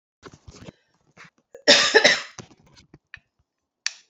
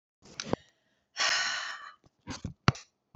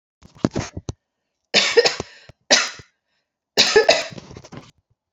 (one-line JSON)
{"cough_length": "4.1 s", "cough_amplitude": 32767, "cough_signal_mean_std_ratio": 0.28, "exhalation_length": "3.2 s", "exhalation_amplitude": 16792, "exhalation_signal_mean_std_ratio": 0.37, "three_cough_length": "5.1 s", "three_cough_amplitude": 32549, "three_cough_signal_mean_std_ratio": 0.36, "survey_phase": "beta (2021-08-13 to 2022-03-07)", "age": "45-64", "gender": "Female", "wearing_mask": "No", "symptom_cough_any": true, "smoker_status": "Never smoked", "respiratory_condition_asthma": true, "respiratory_condition_other": false, "recruitment_source": "REACT", "submission_delay": "13 days", "covid_test_result": "Negative", "covid_test_method": "RT-qPCR"}